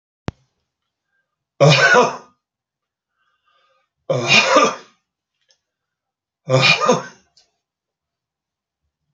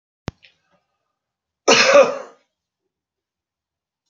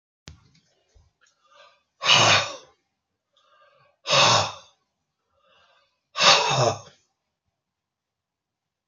{"three_cough_length": "9.1 s", "three_cough_amplitude": 30838, "three_cough_signal_mean_std_ratio": 0.34, "cough_length": "4.1 s", "cough_amplitude": 31320, "cough_signal_mean_std_ratio": 0.27, "exhalation_length": "8.9 s", "exhalation_amplitude": 25196, "exhalation_signal_mean_std_ratio": 0.32, "survey_phase": "alpha (2021-03-01 to 2021-08-12)", "age": "65+", "gender": "Male", "wearing_mask": "No", "symptom_none": true, "smoker_status": "Never smoked", "respiratory_condition_asthma": false, "respiratory_condition_other": false, "recruitment_source": "REACT", "covid_test_method": "RT-qPCR"}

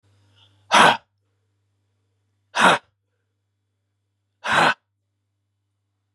{"exhalation_length": "6.1 s", "exhalation_amplitude": 30170, "exhalation_signal_mean_std_ratio": 0.27, "survey_phase": "beta (2021-08-13 to 2022-03-07)", "age": "45-64", "gender": "Male", "wearing_mask": "No", "symptom_sore_throat": true, "smoker_status": "Never smoked", "respiratory_condition_asthma": false, "respiratory_condition_other": false, "recruitment_source": "Test and Trace", "submission_delay": "1 day", "covid_test_result": "Positive", "covid_test_method": "RT-qPCR", "covid_ct_value": 31.1, "covid_ct_gene": "ORF1ab gene", "covid_ct_mean": 31.1, "covid_viral_load": "61 copies/ml", "covid_viral_load_category": "Minimal viral load (< 10K copies/ml)"}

